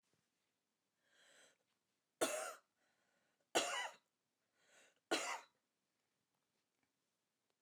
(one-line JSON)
{"cough_length": "7.6 s", "cough_amplitude": 2343, "cough_signal_mean_std_ratio": 0.27, "survey_phase": "alpha (2021-03-01 to 2021-08-12)", "age": "65+", "gender": "Female", "wearing_mask": "No", "symptom_none": true, "smoker_status": "Ex-smoker", "respiratory_condition_asthma": false, "respiratory_condition_other": true, "recruitment_source": "REACT", "submission_delay": "2 days", "covid_test_result": "Negative", "covid_test_method": "RT-qPCR"}